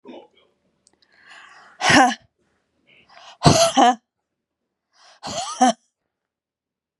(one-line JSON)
{"exhalation_length": "7.0 s", "exhalation_amplitude": 32767, "exhalation_signal_mean_std_ratio": 0.31, "survey_phase": "beta (2021-08-13 to 2022-03-07)", "age": "18-44", "gender": "Female", "wearing_mask": "No", "symptom_sore_throat": true, "symptom_onset": "12 days", "smoker_status": "Current smoker (e-cigarettes or vapes only)", "respiratory_condition_asthma": false, "respiratory_condition_other": false, "recruitment_source": "REACT", "submission_delay": "1 day", "covid_test_result": "Negative", "covid_test_method": "RT-qPCR", "influenza_a_test_result": "Negative", "influenza_b_test_result": "Negative"}